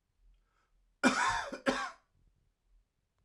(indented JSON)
{
  "cough_length": "3.2 s",
  "cough_amplitude": 6748,
  "cough_signal_mean_std_ratio": 0.36,
  "survey_phase": "alpha (2021-03-01 to 2021-08-12)",
  "age": "18-44",
  "gender": "Male",
  "wearing_mask": "No",
  "symptom_headache": true,
  "symptom_change_to_sense_of_smell_or_taste": true,
  "smoker_status": "Current smoker (11 or more cigarettes per day)",
  "respiratory_condition_asthma": false,
  "respiratory_condition_other": false,
  "recruitment_source": "Test and Trace",
  "submission_delay": "1 day",
  "covid_test_result": "Positive",
  "covid_test_method": "RT-qPCR"
}